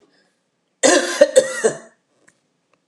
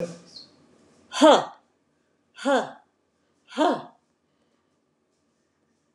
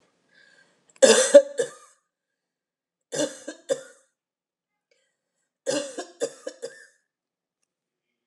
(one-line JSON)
{"cough_length": "2.9 s", "cough_amplitude": 32768, "cough_signal_mean_std_ratio": 0.36, "exhalation_length": "5.9 s", "exhalation_amplitude": 22283, "exhalation_signal_mean_std_ratio": 0.27, "three_cough_length": "8.3 s", "three_cough_amplitude": 30806, "three_cough_signal_mean_std_ratio": 0.23, "survey_phase": "alpha (2021-03-01 to 2021-08-12)", "age": "65+", "gender": "Female", "wearing_mask": "No", "symptom_none": true, "smoker_status": "Never smoked", "respiratory_condition_asthma": false, "respiratory_condition_other": false, "recruitment_source": "REACT", "submission_delay": "1 day", "covid_test_result": "Negative", "covid_test_method": "RT-qPCR"}